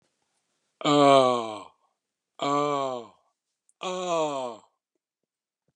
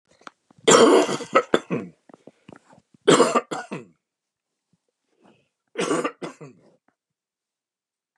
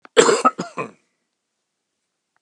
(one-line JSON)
{"exhalation_length": "5.8 s", "exhalation_amplitude": 17215, "exhalation_signal_mean_std_ratio": 0.4, "three_cough_length": "8.2 s", "three_cough_amplitude": 30881, "three_cough_signal_mean_std_ratio": 0.32, "cough_length": "2.4 s", "cough_amplitude": 32768, "cough_signal_mean_std_ratio": 0.3, "survey_phase": "beta (2021-08-13 to 2022-03-07)", "age": "65+", "gender": "Male", "wearing_mask": "No", "symptom_none": true, "smoker_status": "Ex-smoker", "respiratory_condition_asthma": false, "respiratory_condition_other": false, "recruitment_source": "REACT", "submission_delay": "6 days", "covid_test_result": "Negative", "covid_test_method": "RT-qPCR", "influenza_a_test_result": "Negative", "influenza_b_test_result": "Negative"}